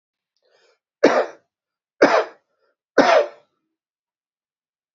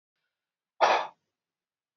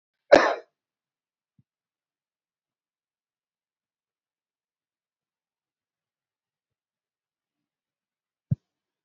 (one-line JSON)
{"three_cough_length": "4.9 s", "three_cough_amplitude": 29030, "three_cough_signal_mean_std_ratio": 0.3, "exhalation_length": "2.0 s", "exhalation_amplitude": 11030, "exhalation_signal_mean_std_ratio": 0.27, "cough_length": "9.0 s", "cough_amplitude": 26762, "cough_signal_mean_std_ratio": 0.11, "survey_phase": "beta (2021-08-13 to 2022-03-07)", "age": "65+", "gender": "Male", "wearing_mask": "No", "symptom_cough_any": true, "symptom_new_continuous_cough": true, "symptom_runny_or_blocked_nose": true, "symptom_shortness_of_breath": true, "symptom_sore_throat": true, "symptom_headache": true, "symptom_change_to_sense_of_smell_or_taste": true, "symptom_loss_of_taste": true, "symptom_onset": "6 days", "smoker_status": "Never smoked", "respiratory_condition_asthma": false, "respiratory_condition_other": false, "recruitment_source": "Test and Trace", "submission_delay": "2 days", "covid_test_result": "Positive", "covid_test_method": "ePCR"}